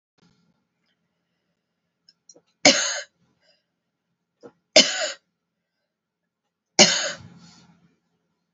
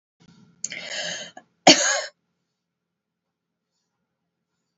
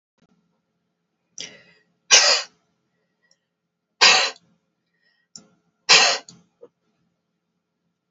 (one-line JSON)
{"three_cough_length": "8.5 s", "three_cough_amplitude": 32768, "three_cough_signal_mean_std_ratio": 0.22, "cough_length": "4.8 s", "cough_amplitude": 31299, "cough_signal_mean_std_ratio": 0.23, "exhalation_length": "8.1 s", "exhalation_amplitude": 32768, "exhalation_signal_mean_std_ratio": 0.26, "survey_phase": "beta (2021-08-13 to 2022-03-07)", "age": "45-64", "gender": "Female", "wearing_mask": "No", "symptom_none": true, "smoker_status": "Ex-smoker", "respiratory_condition_asthma": true, "respiratory_condition_other": false, "recruitment_source": "REACT", "submission_delay": "1 day", "covid_test_result": "Negative", "covid_test_method": "RT-qPCR"}